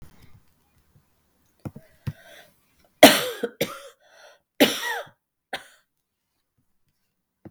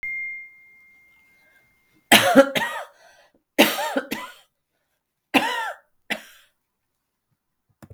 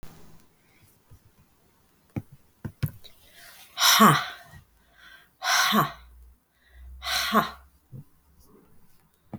{"cough_length": "7.5 s", "cough_amplitude": 32768, "cough_signal_mean_std_ratio": 0.2, "three_cough_length": "7.9 s", "three_cough_amplitude": 32768, "three_cough_signal_mean_std_ratio": 0.31, "exhalation_length": "9.4 s", "exhalation_amplitude": 20718, "exhalation_signal_mean_std_ratio": 0.33, "survey_phase": "beta (2021-08-13 to 2022-03-07)", "age": "45-64", "gender": "Female", "wearing_mask": "No", "symptom_cough_any": true, "symptom_runny_or_blocked_nose": true, "symptom_fatigue": true, "symptom_headache": true, "symptom_change_to_sense_of_smell_or_taste": true, "symptom_onset": "4 days", "smoker_status": "Never smoked", "respiratory_condition_asthma": false, "respiratory_condition_other": false, "recruitment_source": "Test and Trace", "submission_delay": "1 day", "covid_test_result": "Positive", "covid_test_method": "RT-qPCR", "covid_ct_value": 15.8, "covid_ct_gene": "ORF1ab gene", "covid_ct_mean": 16.0, "covid_viral_load": "5800000 copies/ml", "covid_viral_load_category": "High viral load (>1M copies/ml)"}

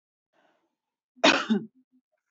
{"cough_length": "2.3 s", "cough_amplitude": 17554, "cough_signal_mean_std_ratio": 0.28, "survey_phase": "alpha (2021-03-01 to 2021-08-12)", "age": "18-44", "gender": "Female", "wearing_mask": "No", "symptom_none": true, "smoker_status": "Never smoked", "respiratory_condition_asthma": false, "respiratory_condition_other": false, "recruitment_source": "REACT", "submission_delay": "1 day", "covid_test_result": "Negative", "covid_test_method": "RT-qPCR"}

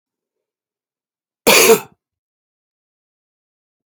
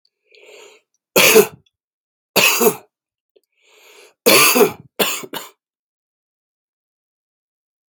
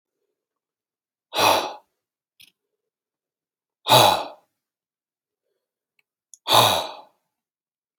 {"cough_length": "3.9 s", "cough_amplitude": 32768, "cough_signal_mean_std_ratio": 0.23, "three_cough_length": "7.9 s", "three_cough_amplitude": 32767, "three_cough_signal_mean_std_ratio": 0.33, "exhalation_length": "8.0 s", "exhalation_amplitude": 32767, "exhalation_signal_mean_std_ratio": 0.28, "survey_phase": "beta (2021-08-13 to 2022-03-07)", "age": "45-64", "gender": "Male", "wearing_mask": "No", "symptom_cough_any": true, "symptom_new_continuous_cough": true, "symptom_shortness_of_breath": true, "symptom_fatigue": true, "symptom_fever_high_temperature": true, "symptom_onset": "5 days", "smoker_status": "Never smoked", "respiratory_condition_asthma": false, "respiratory_condition_other": false, "recruitment_source": "Test and Trace", "submission_delay": "2 days", "covid_test_result": "Positive", "covid_test_method": "RT-qPCR", "covid_ct_value": 20.0, "covid_ct_gene": "ORF1ab gene", "covid_ct_mean": 21.3, "covid_viral_load": "110000 copies/ml", "covid_viral_load_category": "Low viral load (10K-1M copies/ml)"}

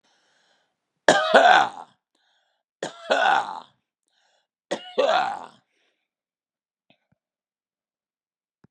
{"three_cough_length": "8.7 s", "three_cough_amplitude": 32767, "three_cough_signal_mean_std_ratio": 0.31, "survey_phase": "beta (2021-08-13 to 2022-03-07)", "age": "65+", "gender": "Male", "wearing_mask": "No", "symptom_none": true, "smoker_status": "Never smoked", "respiratory_condition_asthma": false, "respiratory_condition_other": false, "recruitment_source": "REACT", "submission_delay": "1 day", "covid_test_result": "Negative", "covid_test_method": "RT-qPCR", "influenza_a_test_result": "Negative", "influenza_b_test_result": "Negative"}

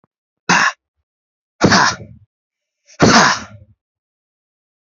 {"exhalation_length": "4.9 s", "exhalation_amplitude": 32553, "exhalation_signal_mean_std_ratio": 0.36, "survey_phase": "alpha (2021-03-01 to 2021-08-12)", "age": "18-44", "gender": "Male", "wearing_mask": "No", "symptom_cough_any": true, "symptom_shortness_of_breath": true, "symptom_fatigue": true, "symptom_headache": true, "symptom_change_to_sense_of_smell_or_taste": true, "symptom_onset": "3 days", "smoker_status": "Never smoked", "respiratory_condition_asthma": false, "respiratory_condition_other": false, "recruitment_source": "Test and Trace", "submission_delay": "1 day", "covid_test_result": "Positive", "covid_test_method": "RT-qPCR", "covid_ct_value": 18.8, "covid_ct_gene": "ORF1ab gene", "covid_ct_mean": 19.6, "covid_viral_load": "370000 copies/ml", "covid_viral_load_category": "Low viral load (10K-1M copies/ml)"}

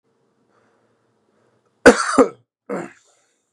{"cough_length": "3.5 s", "cough_amplitude": 32768, "cough_signal_mean_std_ratio": 0.23, "survey_phase": "beta (2021-08-13 to 2022-03-07)", "age": "18-44", "gender": "Male", "wearing_mask": "No", "symptom_sore_throat": true, "symptom_fatigue": true, "symptom_onset": "3 days", "smoker_status": "Never smoked", "respiratory_condition_asthma": false, "respiratory_condition_other": false, "recruitment_source": "Test and Trace", "submission_delay": "2 days", "covid_test_result": "Positive", "covid_test_method": "RT-qPCR"}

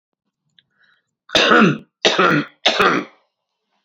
{"three_cough_length": "3.8 s", "three_cough_amplitude": 32767, "three_cough_signal_mean_std_ratio": 0.45, "survey_phase": "beta (2021-08-13 to 2022-03-07)", "age": "45-64", "gender": "Male", "wearing_mask": "No", "symptom_cough_any": true, "smoker_status": "Current smoker (11 or more cigarettes per day)", "respiratory_condition_asthma": false, "respiratory_condition_other": false, "recruitment_source": "REACT", "submission_delay": "2 days", "covid_test_result": "Negative", "covid_test_method": "RT-qPCR", "influenza_a_test_result": "Negative", "influenza_b_test_result": "Negative"}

